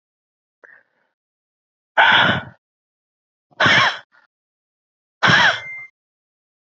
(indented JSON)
{
  "exhalation_length": "6.7 s",
  "exhalation_amplitude": 27773,
  "exhalation_signal_mean_std_ratio": 0.34,
  "survey_phase": "beta (2021-08-13 to 2022-03-07)",
  "age": "45-64",
  "gender": "Male",
  "wearing_mask": "No",
  "symptom_cough_any": true,
  "symptom_runny_or_blocked_nose": true,
  "symptom_sore_throat": true,
  "symptom_fatigue": true,
  "symptom_change_to_sense_of_smell_or_taste": true,
  "symptom_loss_of_taste": true,
  "symptom_other": true,
  "symptom_onset": "3 days",
  "smoker_status": "Ex-smoker",
  "respiratory_condition_asthma": false,
  "respiratory_condition_other": false,
  "recruitment_source": "Test and Trace",
  "submission_delay": "1 day",
  "covid_test_result": "Positive",
  "covid_test_method": "RT-qPCR",
  "covid_ct_value": 23.5,
  "covid_ct_gene": "ORF1ab gene"
}